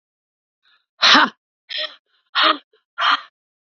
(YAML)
exhalation_length: 3.7 s
exhalation_amplitude: 30425
exhalation_signal_mean_std_ratio: 0.35
survey_phase: beta (2021-08-13 to 2022-03-07)
age: 45-64
gender: Female
wearing_mask: 'No'
symptom_sore_throat: true
smoker_status: Never smoked
respiratory_condition_asthma: false
respiratory_condition_other: false
recruitment_source: Test and Trace
submission_delay: 2 days
covid_test_result: Positive
covid_test_method: RT-qPCR
covid_ct_value: 30.3
covid_ct_gene: ORF1ab gene